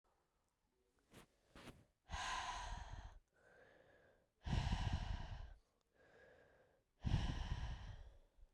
{
  "exhalation_length": "8.5 s",
  "exhalation_amplitude": 1581,
  "exhalation_signal_mean_std_ratio": 0.49,
  "survey_phase": "beta (2021-08-13 to 2022-03-07)",
  "age": "45-64",
  "gender": "Female",
  "wearing_mask": "No",
  "symptom_cough_any": true,
  "symptom_new_continuous_cough": true,
  "symptom_runny_or_blocked_nose": true,
  "symptom_fatigue": true,
  "symptom_fever_high_temperature": true,
  "symptom_headache": true,
  "symptom_onset": "3 days",
  "smoker_status": "Never smoked",
  "respiratory_condition_asthma": false,
  "respiratory_condition_other": false,
  "recruitment_source": "Test and Trace",
  "submission_delay": "2 days",
  "covid_test_result": "Positive",
  "covid_test_method": "ePCR"
}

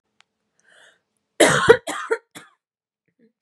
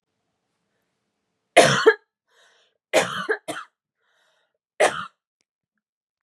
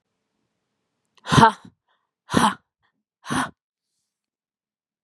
{
  "cough_length": "3.4 s",
  "cough_amplitude": 32767,
  "cough_signal_mean_std_ratio": 0.27,
  "three_cough_length": "6.2 s",
  "three_cough_amplitude": 32108,
  "three_cough_signal_mean_std_ratio": 0.27,
  "exhalation_length": "5.0 s",
  "exhalation_amplitude": 32393,
  "exhalation_signal_mean_std_ratio": 0.24,
  "survey_phase": "beta (2021-08-13 to 2022-03-07)",
  "age": "18-44",
  "gender": "Female",
  "wearing_mask": "No",
  "symptom_shortness_of_breath": true,
  "symptom_sore_throat": true,
  "symptom_abdominal_pain": true,
  "symptom_fatigue": true,
  "symptom_headache": true,
  "symptom_other": true,
  "symptom_onset": "5 days",
  "smoker_status": "Ex-smoker",
  "respiratory_condition_asthma": false,
  "respiratory_condition_other": false,
  "recruitment_source": "Test and Trace",
  "submission_delay": "2 days",
  "covid_test_result": "Positive",
  "covid_test_method": "RT-qPCR",
  "covid_ct_value": 15.6,
  "covid_ct_gene": "ORF1ab gene"
}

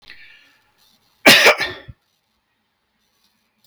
{
  "cough_length": "3.7 s",
  "cough_amplitude": 32768,
  "cough_signal_mean_std_ratio": 0.26,
  "survey_phase": "beta (2021-08-13 to 2022-03-07)",
  "age": "65+",
  "gender": "Male",
  "wearing_mask": "No",
  "symptom_cough_any": true,
  "symptom_runny_or_blocked_nose": true,
  "smoker_status": "Never smoked",
  "respiratory_condition_asthma": false,
  "respiratory_condition_other": false,
  "recruitment_source": "REACT",
  "submission_delay": "5 days",
  "covid_test_result": "Negative",
  "covid_test_method": "RT-qPCR",
  "influenza_a_test_result": "Negative",
  "influenza_b_test_result": "Negative"
}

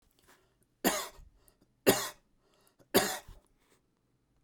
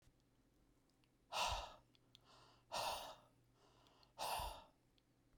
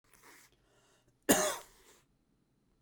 {
  "three_cough_length": "4.4 s",
  "three_cough_amplitude": 10779,
  "three_cough_signal_mean_std_ratio": 0.27,
  "exhalation_length": "5.4 s",
  "exhalation_amplitude": 1149,
  "exhalation_signal_mean_std_ratio": 0.43,
  "cough_length": "2.8 s",
  "cough_amplitude": 9899,
  "cough_signal_mean_std_ratio": 0.25,
  "survey_phase": "beta (2021-08-13 to 2022-03-07)",
  "age": "45-64",
  "gender": "Male",
  "wearing_mask": "No",
  "symptom_none": true,
  "symptom_onset": "9 days",
  "smoker_status": "Never smoked",
  "respiratory_condition_asthma": false,
  "respiratory_condition_other": false,
  "recruitment_source": "REACT",
  "submission_delay": "3 days",
  "covid_test_result": "Negative",
  "covid_test_method": "RT-qPCR"
}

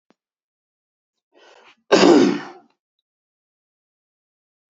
{
  "cough_length": "4.7 s",
  "cough_amplitude": 27400,
  "cough_signal_mean_std_ratio": 0.25,
  "survey_phase": "beta (2021-08-13 to 2022-03-07)",
  "age": "18-44",
  "gender": "Male",
  "wearing_mask": "No",
  "symptom_none": true,
  "symptom_onset": "13 days",
  "smoker_status": "Never smoked",
  "respiratory_condition_asthma": false,
  "respiratory_condition_other": false,
  "recruitment_source": "REACT",
  "submission_delay": "3 days",
  "covid_test_result": "Negative",
  "covid_test_method": "RT-qPCR",
  "influenza_a_test_result": "Negative",
  "influenza_b_test_result": "Negative"
}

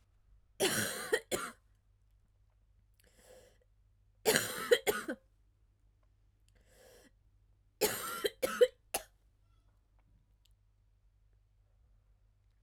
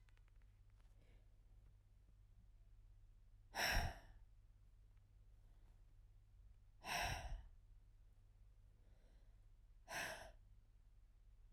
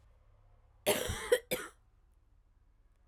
{
  "three_cough_length": "12.6 s",
  "three_cough_amplitude": 10786,
  "three_cough_signal_mean_std_ratio": 0.29,
  "exhalation_length": "11.5 s",
  "exhalation_amplitude": 1424,
  "exhalation_signal_mean_std_ratio": 0.43,
  "cough_length": "3.1 s",
  "cough_amplitude": 5520,
  "cough_signal_mean_std_ratio": 0.33,
  "survey_phase": "beta (2021-08-13 to 2022-03-07)",
  "age": "18-44",
  "gender": "Female",
  "wearing_mask": "No",
  "symptom_cough_any": true,
  "symptom_runny_or_blocked_nose": true,
  "symptom_sore_throat": true,
  "symptom_diarrhoea": true,
  "symptom_headache": true,
  "symptom_onset": "3 days",
  "smoker_status": "Never smoked",
  "respiratory_condition_asthma": false,
  "respiratory_condition_other": false,
  "recruitment_source": "Test and Trace",
  "submission_delay": "2 days",
  "covid_test_result": "Positive",
  "covid_test_method": "RT-qPCR"
}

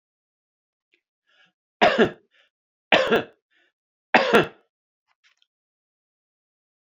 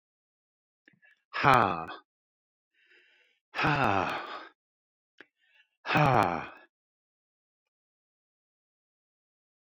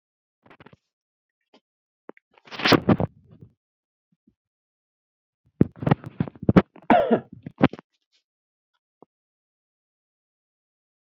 {
  "three_cough_length": "6.9 s",
  "three_cough_amplitude": 27805,
  "three_cough_signal_mean_std_ratio": 0.26,
  "exhalation_length": "9.7 s",
  "exhalation_amplitude": 18252,
  "exhalation_signal_mean_std_ratio": 0.29,
  "cough_length": "11.2 s",
  "cough_amplitude": 28760,
  "cough_signal_mean_std_ratio": 0.21,
  "survey_phase": "beta (2021-08-13 to 2022-03-07)",
  "age": "65+",
  "gender": "Male",
  "wearing_mask": "No",
  "symptom_none": true,
  "smoker_status": "Ex-smoker",
  "respiratory_condition_asthma": false,
  "respiratory_condition_other": false,
  "recruitment_source": "REACT",
  "submission_delay": "3 days",
  "covid_test_result": "Negative",
  "covid_test_method": "RT-qPCR",
  "influenza_a_test_result": "Negative",
  "influenza_b_test_result": "Negative"
}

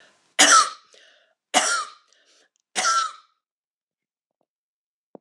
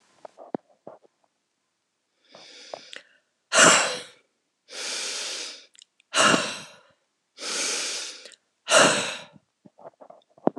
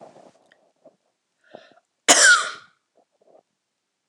{
  "three_cough_length": "5.2 s",
  "three_cough_amplitude": 26028,
  "three_cough_signal_mean_std_ratio": 0.32,
  "exhalation_length": "10.6 s",
  "exhalation_amplitude": 25789,
  "exhalation_signal_mean_std_ratio": 0.35,
  "cough_length": "4.1 s",
  "cough_amplitude": 26028,
  "cough_signal_mean_std_ratio": 0.25,
  "survey_phase": "beta (2021-08-13 to 2022-03-07)",
  "age": "65+",
  "gender": "Female",
  "wearing_mask": "No",
  "symptom_none": true,
  "smoker_status": "Never smoked",
  "respiratory_condition_asthma": false,
  "respiratory_condition_other": false,
  "recruitment_source": "REACT",
  "submission_delay": "3 days",
  "covid_test_result": "Negative",
  "covid_test_method": "RT-qPCR",
  "covid_ct_value": 41.0,
  "covid_ct_gene": "N gene"
}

